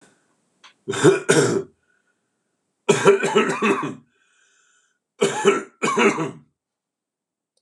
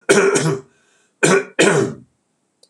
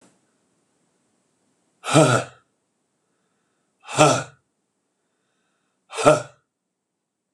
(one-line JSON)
{"three_cough_length": "7.6 s", "three_cough_amplitude": 26028, "three_cough_signal_mean_std_ratio": 0.44, "cough_length": "2.7 s", "cough_amplitude": 26028, "cough_signal_mean_std_ratio": 0.54, "exhalation_length": "7.3 s", "exhalation_amplitude": 26028, "exhalation_signal_mean_std_ratio": 0.25, "survey_phase": "beta (2021-08-13 to 2022-03-07)", "age": "65+", "gender": "Male", "wearing_mask": "No", "symptom_cough_any": true, "symptom_runny_or_blocked_nose": true, "symptom_shortness_of_breath": true, "symptom_fatigue": true, "symptom_headache": true, "smoker_status": "Ex-smoker", "respiratory_condition_asthma": false, "respiratory_condition_other": false, "recruitment_source": "REACT", "submission_delay": "8 days", "covid_test_result": "Negative", "covid_test_method": "RT-qPCR", "influenza_a_test_result": "Negative", "influenza_b_test_result": "Negative"}